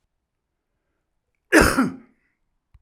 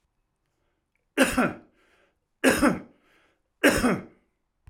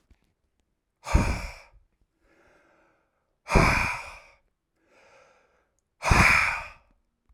{
  "cough_length": "2.8 s",
  "cough_amplitude": 32767,
  "cough_signal_mean_std_ratio": 0.27,
  "three_cough_length": "4.7 s",
  "three_cough_amplitude": 17539,
  "three_cough_signal_mean_std_ratio": 0.36,
  "exhalation_length": "7.3 s",
  "exhalation_amplitude": 19579,
  "exhalation_signal_mean_std_ratio": 0.34,
  "survey_phase": "alpha (2021-03-01 to 2021-08-12)",
  "age": "65+",
  "gender": "Male",
  "wearing_mask": "No",
  "symptom_none": true,
  "smoker_status": "Ex-smoker",
  "respiratory_condition_asthma": false,
  "respiratory_condition_other": false,
  "recruitment_source": "REACT",
  "submission_delay": "1 day",
  "covid_test_result": "Negative",
  "covid_test_method": "RT-qPCR"
}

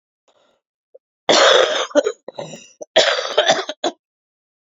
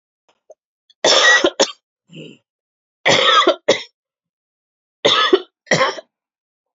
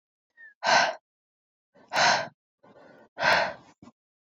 {
  "cough_length": "4.8 s",
  "cough_amplitude": 29815,
  "cough_signal_mean_std_ratio": 0.43,
  "three_cough_length": "6.7 s",
  "three_cough_amplitude": 30478,
  "three_cough_signal_mean_std_ratio": 0.41,
  "exhalation_length": "4.4 s",
  "exhalation_amplitude": 14117,
  "exhalation_signal_mean_std_ratio": 0.38,
  "survey_phase": "beta (2021-08-13 to 2022-03-07)",
  "age": "18-44",
  "gender": "Female",
  "wearing_mask": "No",
  "symptom_cough_any": true,
  "symptom_runny_or_blocked_nose": true,
  "symptom_sore_throat": true,
  "symptom_fatigue": true,
  "symptom_fever_high_temperature": true,
  "symptom_headache": true,
  "symptom_change_to_sense_of_smell_or_taste": true,
  "symptom_loss_of_taste": true,
  "smoker_status": "Prefer not to say",
  "respiratory_condition_asthma": false,
  "respiratory_condition_other": false,
  "recruitment_source": "Test and Trace",
  "submission_delay": "2 days",
  "covid_test_result": "Positive",
  "covid_test_method": "LFT"
}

